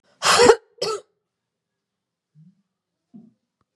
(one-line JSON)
{"cough_length": "3.8 s", "cough_amplitude": 32767, "cough_signal_mean_std_ratio": 0.26, "survey_phase": "beta (2021-08-13 to 2022-03-07)", "age": "65+", "gender": "Female", "wearing_mask": "No", "symptom_none": true, "smoker_status": "Never smoked", "respiratory_condition_asthma": false, "respiratory_condition_other": false, "recruitment_source": "REACT", "submission_delay": "2 days", "covid_test_result": "Negative", "covid_test_method": "RT-qPCR", "influenza_a_test_result": "Negative", "influenza_b_test_result": "Negative"}